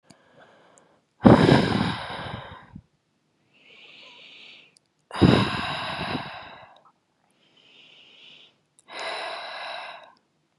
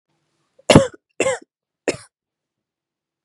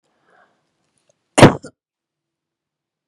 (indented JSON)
{
  "exhalation_length": "10.6 s",
  "exhalation_amplitude": 32768,
  "exhalation_signal_mean_std_ratio": 0.32,
  "three_cough_length": "3.2 s",
  "three_cough_amplitude": 32768,
  "three_cough_signal_mean_std_ratio": 0.23,
  "cough_length": "3.1 s",
  "cough_amplitude": 32768,
  "cough_signal_mean_std_ratio": 0.17,
  "survey_phase": "beta (2021-08-13 to 2022-03-07)",
  "age": "18-44",
  "gender": "Female",
  "wearing_mask": "No",
  "symptom_cough_any": true,
  "symptom_onset": "4 days",
  "smoker_status": "Never smoked",
  "respiratory_condition_asthma": false,
  "respiratory_condition_other": false,
  "recruitment_source": "Test and Trace",
  "submission_delay": "2 days",
  "covid_test_result": "Negative",
  "covid_test_method": "RT-qPCR"
}